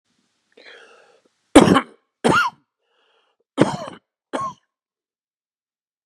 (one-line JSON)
{"three_cough_length": "6.1 s", "three_cough_amplitude": 32768, "three_cough_signal_mean_std_ratio": 0.26, "survey_phase": "beta (2021-08-13 to 2022-03-07)", "age": "45-64", "gender": "Male", "wearing_mask": "No", "symptom_runny_or_blocked_nose": true, "symptom_other": true, "smoker_status": "Never smoked", "respiratory_condition_asthma": false, "respiratory_condition_other": false, "recruitment_source": "Test and Trace", "submission_delay": "2 days", "covid_test_result": "Positive", "covid_test_method": "LFT"}